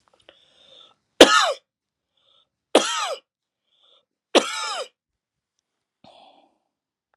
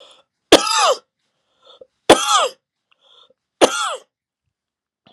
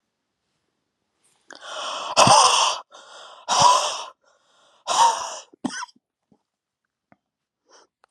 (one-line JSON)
{"three_cough_length": "7.2 s", "three_cough_amplitude": 32768, "three_cough_signal_mean_std_ratio": 0.23, "cough_length": "5.1 s", "cough_amplitude": 32768, "cough_signal_mean_std_ratio": 0.32, "exhalation_length": "8.1 s", "exhalation_amplitude": 31885, "exhalation_signal_mean_std_ratio": 0.37, "survey_phase": "alpha (2021-03-01 to 2021-08-12)", "age": "45-64", "gender": "Male", "wearing_mask": "No", "symptom_fatigue": true, "smoker_status": "Never smoked", "respiratory_condition_asthma": false, "respiratory_condition_other": false, "recruitment_source": "Test and Trace", "submission_delay": "2 days", "covid_test_method": "RT-qPCR"}